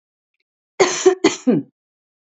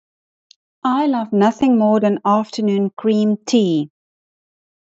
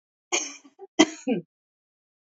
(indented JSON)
{
  "three_cough_length": "2.4 s",
  "three_cough_amplitude": 29065,
  "three_cough_signal_mean_std_ratio": 0.37,
  "exhalation_length": "4.9 s",
  "exhalation_amplitude": 24896,
  "exhalation_signal_mean_std_ratio": 0.66,
  "cough_length": "2.2 s",
  "cough_amplitude": 25424,
  "cough_signal_mean_std_ratio": 0.28,
  "survey_phase": "alpha (2021-03-01 to 2021-08-12)",
  "age": "45-64",
  "gender": "Female",
  "wearing_mask": "No",
  "symptom_none": true,
  "smoker_status": "Never smoked",
  "respiratory_condition_asthma": false,
  "respiratory_condition_other": false,
  "recruitment_source": "REACT",
  "submission_delay": "14 days",
  "covid_test_result": "Negative",
  "covid_test_method": "RT-qPCR"
}